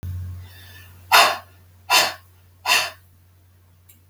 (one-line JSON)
{"exhalation_length": "4.1 s", "exhalation_amplitude": 32766, "exhalation_signal_mean_std_ratio": 0.38, "survey_phase": "beta (2021-08-13 to 2022-03-07)", "age": "45-64", "gender": "Female", "wearing_mask": "No", "symptom_none": true, "smoker_status": "Never smoked", "respiratory_condition_asthma": true, "respiratory_condition_other": false, "recruitment_source": "REACT", "submission_delay": "2 days", "covid_test_result": "Negative", "covid_test_method": "RT-qPCR", "influenza_a_test_result": "Negative", "influenza_b_test_result": "Negative"}